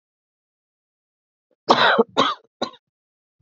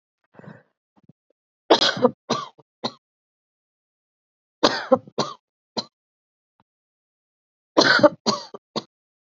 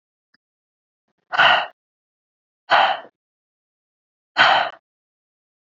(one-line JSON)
{"cough_length": "3.4 s", "cough_amplitude": 28683, "cough_signal_mean_std_ratio": 0.3, "three_cough_length": "9.4 s", "three_cough_amplitude": 29867, "three_cough_signal_mean_std_ratio": 0.26, "exhalation_length": "5.7 s", "exhalation_amplitude": 26981, "exhalation_signal_mean_std_ratio": 0.31, "survey_phase": "beta (2021-08-13 to 2022-03-07)", "age": "18-44", "gender": "Female", "wearing_mask": "No", "symptom_none": true, "symptom_onset": "6 days", "smoker_status": "Never smoked", "respiratory_condition_asthma": false, "respiratory_condition_other": false, "recruitment_source": "REACT", "submission_delay": "4 days", "covid_test_result": "Negative", "covid_test_method": "RT-qPCR", "influenza_a_test_result": "Negative", "influenza_b_test_result": "Negative"}